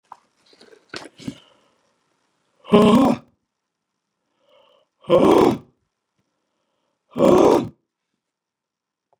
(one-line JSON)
{"exhalation_length": "9.2 s", "exhalation_amplitude": 31555, "exhalation_signal_mean_std_ratio": 0.31, "survey_phase": "beta (2021-08-13 to 2022-03-07)", "age": "65+", "gender": "Male", "wearing_mask": "No", "symptom_none": true, "smoker_status": "Ex-smoker", "respiratory_condition_asthma": false, "respiratory_condition_other": false, "recruitment_source": "REACT", "submission_delay": "1 day", "covid_test_result": "Negative", "covid_test_method": "RT-qPCR", "influenza_a_test_result": "Negative", "influenza_b_test_result": "Negative"}